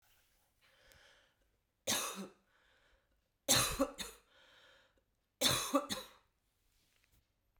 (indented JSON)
{
  "three_cough_length": "7.6 s",
  "three_cough_amplitude": 5071,
  "three_cough_signal_mean_std_ratio": 0.32,
  "survey_phase": "beta (2021-08-13 to 2022-03-07)",
  "age": "45-64",
  "gender": "Female",
  "wearing_mask": "No",
  "symptom_new_continuous_cough": true,
  "symptom_runny_or_blocked_nose": true,
  "symptom_shortness_of_breath": true,
  "symptom_sore_throat": true,
  "symptom_fatigue": true,
  "symptom_change_to_sense_of_smell_or_taste": true,
  "symptom_loss_of_taste": true,
  "symptom_onset": "4 days",
  "smoker_status": "Never smoked",
  "respiratory_condition_asthma": false,
  "respiratory_condition_other": false,
  "recruitment_source": "Test and Trace",
  "submission_delay": "2 days",
  "covid_test_result": "Positive",
  "covid_test_method": "RT-qPCR",
  "covid_ct_value": 20.3,
  "covid_ct_gene": "ORF1ab gene"
}